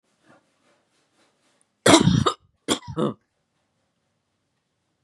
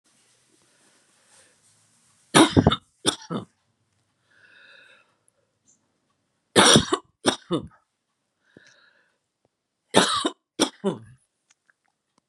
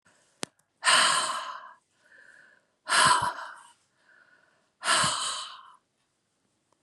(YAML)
cough_length: 5.0 s
cough_amplitude: 32765
cough_signal_mean_std_ratio: 0.26
three_cough_length: 12.3 s
three_cough_amplitude: 32484
three_cough_signal_mean_std_ratio: 0.25
exhalation_length: 6.8 s
exhalation_amplitude: 14878
exhalation_signal_mean_std_ratio: 0.4
survey_phase: beta (2021-08-13 to 2022-03-07)
age: 65+
gender: Female
wearing_mask: 'No'
symptom_none: true
smoker_status: Ex-smoker
respiratory_condition_asthma: false
respiratory_condition_other: false
recruitment_source: REACT
submission_delay: 1 day
covid_test_result: Negative
covid_test_method: RT-qPCR
influenza_a_test_result: Negative
influenza_b_test_result: Negative